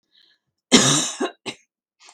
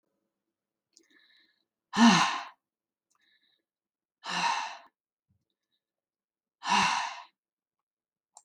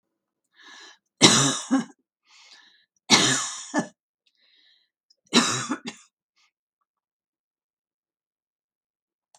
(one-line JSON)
{"cough_length": "2.1 s", "cough_amplitude": 32768, "cough_signal_mean_std_ratio": 0.36, "exhalation_length": "8.4 s", "exhalation_amplitude": 11625, "exhalation_signal_mean_std_ratio": 0.29, "three_cough_length": "9.4 s", "three_cough_amplitude": 32768, "three_cough_signal_mean_std_ratio": 0.29, "survey_phase": "beta (2021-08-13 to 2022-03-07)", "age": "65+", "gender": "Female", "wearing_mask": "No", "symptom_none": true, "symptom_onset": "12 days", "smoker_status": "Never smoked", "respiratory_condition_asthma": false, "respiratory_condition_other": false, "recruitment_source": "REACT", "submission_delay": "1 day", "covid_test_result": "Negative", "covid_test_method": "RT-qPCR", "influenza_a_test_result": "Negative", "influenza_b_test_result": "Negative"}